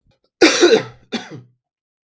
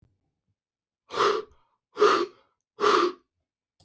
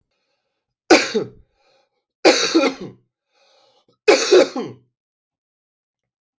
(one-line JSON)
{"cough_length": "2.0 s", "cough_amplitude": 32767, "cough_signal_mean_std_ratio": 0.38, "exhalation_length": "3.8 s", "exhalation_amplitude": 12994, "exhalation_signal_mean_std_ratio": 0.38, "three_cough_length": "6.4 s", "three_cough_amplitude": 31872, "three_cough_signal_mean_std_ratio": 0.33, "survey_phase": "beta (2021-08-13 to 2022-03-07)", "age": "18-44", "gender": "Male", "wearing_mask": "No", "symptom_cough_any": true, "symptom_runny_or_blocked_nose": true, "symptom_sore_throat": true, "symptom_onset": "2 days", "smoker_status": "Never smoked", "respiratory_condition_asthma": false, "respiratory_condition_other": true, "recruitment_source": "Test and Trace", "submission_delay": "1 day", "covid_test_result": "Positive", "covid_test_method": "RT-qPCR", "covid_ct_value": 18.2, "covid_ct_gene": "N gene"}